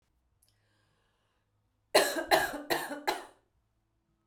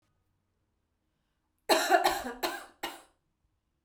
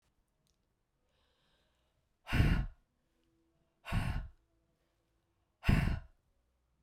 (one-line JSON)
{"cough_length": "4.3 s", "cough_amplitude": 11123, "cough_signal_mean_std_ratio": 0.33, "three_cough_length": "3.8 s", "three_cough_amplitude": 10804, "three_cough_signal_mean_std_ratio": 0.33, "exhalation_length": "6.8 s", "exhalation_amplitude": 6707, "exhalation_signal_mean_std_ratio": 0.31, "survey_phase": "beta (2021-08-13 to 2022-03-07)", "age": "45-64", "gender": "Female", "wearing_mask": "No", "symptom_fatigue": true, "smoker_status": "Never smoked", "respiratory_condition_asthma": false, "respiratory_condition_other": false, "recruitment_source": "REACT", "submission_delay": "2 days", "covid_test_result": "Negative", "covid_test_method": "RT-qPCR"}